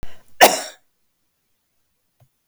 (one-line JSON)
{"cough_length": "2.5 s", "cough_amplitude": 32768, "cough_signal_mean_std_ratio": 0.25, "survey_phase": "beta (2021-08-13 to 2022-03-07)", "age": "45-64", "gender": "Female", "wearing_mask": "No", "symptom_none": true, "smoker_status": "Never smoked", "respiratory_condition_asthma": false, "respiratory_condition_other": false, "recruitment_source": "REACT", "submission_delay": "2 days", "covid_test_result": "Negative", "covid_test_method": "RT-qPCR", "influenza_a_test_result": "Negative", "influenza_b_test_result": "Negative"}